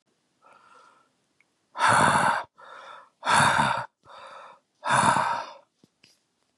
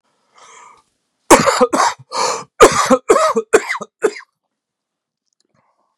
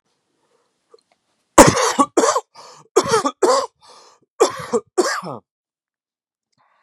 {"exhalation_length": "6.6 s", "exhalation_amplitude": 16751, "exhalation_signal_mean_std_ratio": 0.45, "cough_length": "6.0 s", "cough_amplitude": 32768, "cough_signal_mean_std_ratio": 0.4, "three_cough_length": "6.8 s", "three_cough_amplitude": 32768, "three_cough_signal_mean_std_ratio": 0.35, "survey_phase": "beta (2021-08-13 to 2022-03-07)", "age": "45-64", "gender": "Male", "wearing_mask": "No", "symptom_cough_any": true, "symptom_headache": true, "smoker_status": "Never smoked", "respiratory_condition_asthma": false, "respiratory_condition_other": false, "recruitment_source": "Test and Trace", "submission_delay": "2 days", "covid_test_result": "Positive", "covid_test_method": "LFT"}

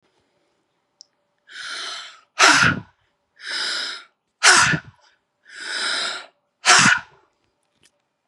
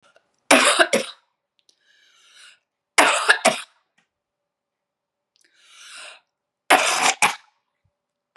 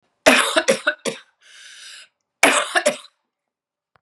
{"exhalation_length": "8.3 s", "exhalation_amplitude": 32679, "exhalation_signal_mean_std_ratio": 0.38, "three_cough_length": "8.4 s", "three_cough_amplitude": 32768, "three_cough_signal_mean_std_ratio": 0.32, "cough_length": "4.0 s", "cough_amplitude": 32768, "cough_signal_mean_std_ratio": 0.39, "survey_phase": "beta (2021-08-13 to 2022-03-07)", "age": "45-64", "gender": "Female", "wearing_mask": "No", "symptom_sore_throat": true, "symptom_fatigue": true, "symptom_fever_high_temperature": true, "symptom_headache": true, "symptom_other": true, "symptom_onset": "2 days", "smoker_status": "Never smoked", "respiratory_condition_asthma": false, "respiratory_condition_other": false, "recruitment_source": "Test and Trace", "submission_delay": "1 day", "covid_test_result": "Positive", "covid_test_method": "RT-qPCR", "covid_ct_value": 30.9, "covid_ct_gene": "ORF1ab gene", "covid_ct_mean": 31.7, "covid_viral_load": "40 copies/ml", "covid_viral_load_category": "Minimal viral load (< 10K copies/ml)"}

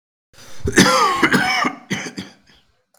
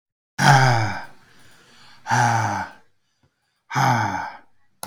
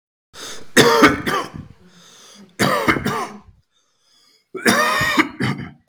{"cough_length": "3.0 s", "cough_amplitude": 32768, "cough_signal_mean_std_ratio": 0.55, "exhalation_length": "4.9 s", "exhalation_amplitude": 32766, "exhalation_signal_mean_std_ratio": 0.48, "three_cough_length": "5.9 s", "three_cough_amplitude": 32768, "three_cough_signal_mean_std_ratio": 0.5, "survey_phase": "beta (2021-08-13 to 2022-03-07)", "age": "18-44", "gender": "Male", "wearing_mask": "No", "symptom_cough_any": true, "symptom_new_continuous_cough": true, "symptom_runny_or_blocked_nose": true, "symptom_shortness_of_breath": true, "symptom_sore_throat": true, "symptom_fatigue": true, "symptom_fever_high_temperature": true, "symptom_headache": true, "symptom_change_to_sense_of_smell_or_taste": true, "symptom_loss_of_taste": true, "smoker_status": "Current smoker (11 or more cigarettes per day)", "respiratory_condition_asthma": false, "respiratory_condition_other": false, "recruitment_source": "Test and Trace", "submission_delay": "2 days", "covid_test_result": "Positive", "covid_test_method": "ePCR"}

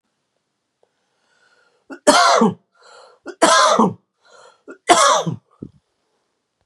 {"three_cough_length": "6.7 s", "three_cough_amplitude": 32768, "three_cough_signal_mean_std_ratio": 0.38, "survey_phase": "beta (2021-08-13 to 2022-03-07)", "age": "18-44", "gender": "Male", "wearing_mask": "No", "symptom_none": true, "smoker_status": "Ex-smoker", "respiratory_condition_asthma": false, "respiratory_condition_other": false, "recruitment_source": "REACT", "submission_delay": "2 days", "covid_test_result": "Negative", "covid_test_method": "RT-qPCR", "influenza_a_test_result": "Negative", "influenza_b_test_result": "Negative"}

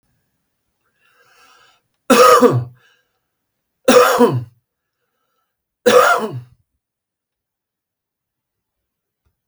{"three_cough_length": "9.5 s", "three_cough_amplitude": 32768, "three_cough_signal_mean_std_ratio": 0.32, "survey_phase": "beta (2021-08-13 to 2022-03-07)", "age": "45-64", "gender": "Male", "wearing_mask": "No", "symptom_none": true, "smoker_status": "Ex-smoker", "respiratory_condition_asthma": false, "respiratory_condition_other": false, "recruitment_source": "REACT", "submission_delay": "4 days", "covid_test_result": "Negative", "covid_test_method": "RT-qPCR", "influenza_a_test_result": "Negative", "influenza_b_test_result": "Negative"}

